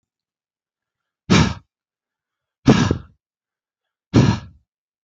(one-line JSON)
{"exhalation_length": "5.0 s", "exhalation_amplitude": 27158, "exhalation_signal_mean_std_ratio": 0.29, "survey_phase": "beta (2021-08-13 to 2022-03-07)", "age": "45-64", "gender": "Male", "wearing_mask": "No", "symptom_sore_throat": true, "symptom_fatigue": true, "symptom_onset": "4 days", "smoker_status": "Never smoked", "respiratory_condition_asthma": false, "respiratory_condition_other": false, "recruitment_source": "REACT", "submission_delay": "2 days", "covid_test_result": "Negative", "covid_test_method": "RT-qPCR"}